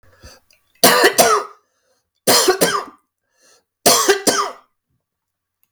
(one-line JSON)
{"three_cough_length": "5.7 s", "three_cough_amplitude": 32768, "three_cough_signal_mean_std_ratio": 0.44, "survey_phase": "beta (2021-08-13 to 2022-03-07)", "age": "45-64", "gender": "Male", "wearing_mask": "No", "symptom_none": true, "smoker_status": "Never smoked", "respiratory_condition_asthma": false, "respiratory_condition_other": false, "recruitment_source": "REACT", "submission_delay": "0 days", "covid_test_result": "Negative", "covid_test_method": "RT-qPCR", "influenza_a_test_result": "Unknown/Void", "influenza_b_test_result": "Unknown/Void"}